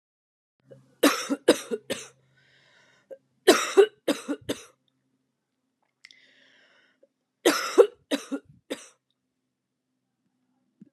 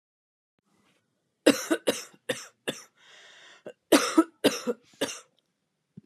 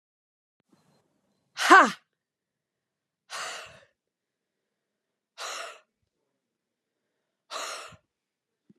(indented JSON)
{
  "three_cough_length": "10.9 s",
  "three_cough_amplitude": 22553,
  "three_cough_signal_mean_std_ratio": 0.25,
  "cough_length": "6.1 s",
  "cough_amplitude": 20241,
  "cough_signal_mean_std_ratio": 0.29,
  "exhalation_length": "8.8 s",
  "exhalation_amplitude": 25641,
  "exhalation_signal_mean_std_ratio": 0.17,
  "survey_phase": "beta (2021-08-13 to 2022-03-07)",
  "age": "45-64",
  "gender": "Female",
  "wearing_mask": "No",
  "symptom_cough_any": true,
  "symptom_runny_or_blocked_nose": true,
  "symptom_sore_throat": true,
  "symptom_fatigue": true,
  "symptom_fever_high_temperature": true,
  "symptom_headache": true,
  "symptom_change_to_sense_of_smell_or_taste": true,
  "symptom_onset": "5 days",
  "smoker_status": "Never smoked",
  "respiratory_condition_asthma": false,
  "respiratory_condition_other": false,
  "recruitment_source": "Test and Trace",
  "submission_delay": "3 days",
  "covid_test_result": "Positive",
  "covid_test_method": "RT-qPCR",
  "covid_ct_value": 23.1,
  "covid_ct_gene": "ORF1ab gene"
}